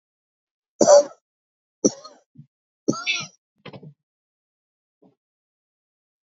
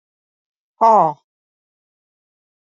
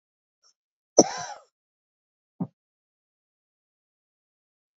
three_cough_length: 6.2 s
three_cough_amplitude: 29294
three_cough_signal_mean_std_ratio: 0.21
exhalation_length: 2.7 s
exhalation_amplitude: 27977
exhalation_signal_mean_std_ratio: 0.25
cough_length: 4.8 s
cough_amplitude: 28917
cough_signal_mean_std_ratio: 0.13
survey_phase: beta (2021-08-13 to 2022-03-07)
age: 65+
gender: Female
wearing_mask: 'No'
symptom_none: true
smoker_status: Never smoked
respiratory_condition_asthma: false
respiratory_condition_other: false
recruitment_source: REACT
submission_delay: 2 days
covid_test_result: Negative
covid_test_method: RT-qPCR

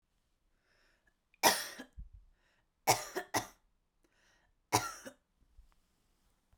three_cough_length: 6.6 s
three_cough_amplitude: 8934
three_cough_signal_mean_std_ratio: 0.25
survey_phase: beta (2021-08-13 to 2022-03-07)
age: 18-44
gender: Female
wearing_mask: 'No'
symptom_none: true
smoker_status: Never smoked
respiratory_condition_asthma: false
respiratory_condition_other: false
recruitment_source: REACT
submission_delay: 2 days
covid_test_result: Negative
covid_test_method: RT-qPCR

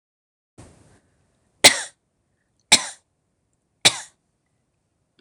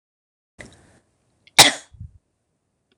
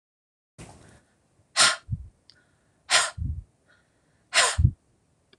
three_cough_length: 5.2 s
three_cough_amplitude: 26028
three_cough_signal_mean_std_ratio: 0.17
cough_length: 3.0 s
cough_amplitude: 26028
cough_signal_mean_std_ratio: 0.17
exhalation_length: 5.4 s
exhalation_amplitude: 18541
exhalation_signal_mean_std_ratio: 0.32
survey_phase: alpha (2021-03-01 to 2021-08-12)
age: 45-64
gender: Female
wearing_mask: 'No'
symptom_none: true
smoker_status: Ex-smoker
respiratory_condition_asthma: false
respiratory_condition_other: false
recruitment_source: REACT
submission_delay: 2 days
covid_test_result: Negative
covid_test_method: RT-qPCR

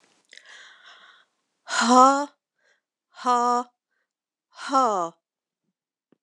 exhalation_length: 6.2 s
exhalation_amplitude: 24340
exhalation_signal_mean_std_ratio: 0.32
survey_phase: alpha (2021-03-01 to 2021-08-12)
age: 45-64
gender: Female
wearing_mask: 'No'
symptom_none: true
smoker_status: Ex-smoker
respiratory_condition_asthma: false
respiratory_condition_other: false
recruitment_source: REACT
submission_delay: 3 days
covid_test_result: Negative
covid_test_method: RT-qPCR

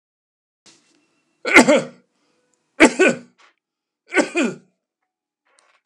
three_cough_length: 5.9 s
three_cough_amplitude: 32768
three_cough_signal_mean_std_ratio: 0.29
survey_phase: beta (2021-08-13 to 2022-03-07)
age: 65+
gender: Male
wearing_mask: 'No'
symptom_fatigue: true
symptom_onset: 12 days
smoker_status: Never smoked
respiratory_condition_asthma: false
respiratory_condition_other: false
recruitment_source: REACT
submission_delay: 6 days
covid_test_result: Negative
covid_test_method: RT-qPCR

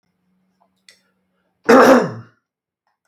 cough_length: 3.1 s
cough_amplitude: 32768
cough_signal_mean_std_ratio: 0.3
survey_phase: beta (2021-08-13 to 2022-03-07)
age: 65+
gender: Male
wearing_mask: 'No'
symptom_none: true
smoker_status: Ex-smoker
respiratory_condition_asthma: false
respiratory_condition_other: false
recruitment_source: REACT
submission_delay: 0 days
covid_test_result: Negative
covid_test_method: RT-qPCR
influenza_a_test_result: Unknown/Void
influenza_b_test_result: Unknown/Void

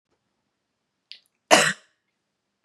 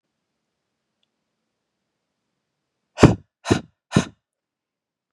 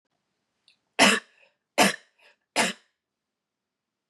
cough_length: 2.6 s
cough_amplitude: 32767
cough_signal_mean_std_ratio: 0.21
exhalation_length: 5.1 s
exhalation_amplitude: 32768
exhalation_signal_mean_std_ratio: 0.17
three_cough_length: 4.1 s
three_cough_amplitude: 21566
three_cough_signal_mean_std_ratio: 0.27
survey_phase: beta (2021-08-13 to 2022-03-07)
age: 18-44
gender: Female
wearing_mask: 'No'
symptom_runny_or_blocked_nose: true
symptom_onset: 7 days
smoker_status: Current smoker (e-cigarettes or vapes only)
respiratory_condition_asthma: false
respiratory_condition_other: false
recruitment_source: REACT
submission_delay: 2 days
covid_test_result: Negative
covid_test_method: RT-qPCR
influenza_a_test_result: Negative
influenza_b_test_result: Negative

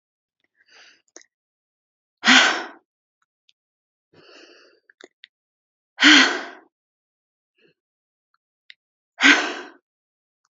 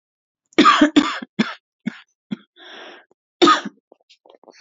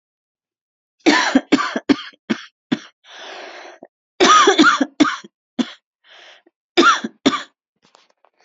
exhalation_length: 10.5 s
exhalation_amplitude: 29796
exhalation_signal_mean_std_ratio: 0.24
cough_length: 4.6 s
cough_amplitude: 29242
cough_signal_mean_std_ratio: 0.34
three_cough_length: 8.4 s
three_cough_amplitude: 31445
three_cough_signal_mean_std_ratio: 0.39
survey_phase: beta (2021-08-13 to 2022-03-07)
age: 18-44
gender: Female
wearing_mask: 'Yes'
symptom_shortness_of_breath: true
symptom_sore_throat: true
symptom_fatigue: true
symptom_headache: true
symptom_change_to_sense_of_smell_or_taste: true
symptom_loss_of_taste: true
symptom_other: true
symptom_onset: 8 days
smoker_status: Never smoked
respiratory_condition_asthma: false
respiratory_condition_other: false
recruitment_source: Test and Trace
submission_delay: 2 days
covid_test_result: Positive
covid_test_method: ePCR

